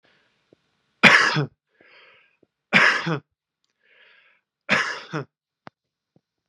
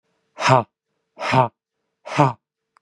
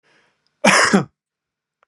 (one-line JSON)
{"three_cough_length": "6.5 s", "three_cough_amplitude": 32767, "three_cough_signal_mean_std_ratio": 0.3, "exhalation_length": "2.8 s", "exhalation_amplitude": 31674, "exhalation_signal_mean_std_ratio": 0.36, "cough_length": "1.9 s", "cough_amplitude": 32630, "cough_signal_mean_std_ratio": 0.36, "survey_phase": "beta (2021-08-13 to 2022-03-07)", "age": "45-64", "gender": "Male", "wearing_mask": "No", "symptom_sore_throat": true, "smoker_status": "Never smoked", "respiratory_condition_asthma": false, "respiratory_condition_other": false, "recruitment_source": "Test and Trace", "submission_delay": "1 day", "covid_test_result": "Positive", "covid_test_method": "RT-qPCR"}